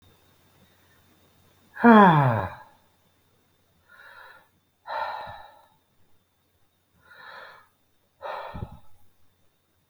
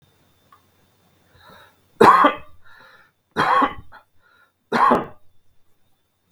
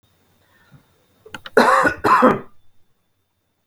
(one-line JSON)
{"exhalation_length": "9.9 s", "exhalation_amplitude": 26646, "exhalation_signal_mean_std_ratio": 0.25, "three_cough_length": "6.3 s", "three_cough_amplitude": 32768, "three_cough_signal_mean_std_ratio": 0.32, "cough_length": "3.7 s", "cough_amplitude": 32768, "cough_signal_mean_std_ratio": 0.37, "survey_phase": "beta (2021-08-13 to 2022-03-07)", "age": "18-44", "gender": "Male", "wearing_mask": "No", "symptom_none": true, "smoker_status": "Ex-smoker", "respiratory_condition_asthma": false, "respiratory_condition_other": false, "recruitment_source": "REACT", "submission_delay": "3 days", "covid_test_result": "Negative", "covid_test_method": "RT-qPCR", "influenza_a_test_result": "Negative", "influenza_b_test_result": "Negative"}